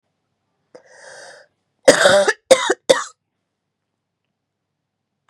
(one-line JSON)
{"cough_length": "5.3 s", "cough_amplitude": 32768, "cough_signal_mean_std_ratio": 0.28, "survey_phase": "beta (2021-08-13 to 2022-03-07)", "age": "45-64", "gender": "Female", "wearing_mask": "No", "symptom_cough_any": true, "symptom_fatigue": true, "symptom_headache": true, "smoker_status": "Never smoked", "respiratory_condition_asthma": false, "respiratory_condition_other": false, "recruitment_source": "Test and Trace", "submission_delay": "2 days", "covid_test_result": "Positive", "covid_test_method": "LFT"}